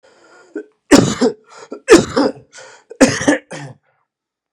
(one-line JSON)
{"three_cough_length": "4.5 s", "three_cough_amplitude": 32768, "three_cough_signal_mean_std_ratio": 0.37, "survey_phase": "beta (2021-08-13 to 2022-03-07)", "age": "18-44", "gender": "Male", "wearing_mask": "No", "symptom_cough_any": true, "symptom_new_continuous_cough": true, "symptom_runny_or_blocked_nose": true, "symptom_sore_throat": true, "symptom_fatigue": true, "symptom_headache": true, "symptom_onset": "2 days", "smoker_status": "Never smoked", "respiratory_condition_asthma": false, "respiratory_condition_other": false, "recruitment_source": "Test and Trace", "submission_delay": "1 day", "covid_test_result": "Negative", "covid_test_method": "RT-qPCR"}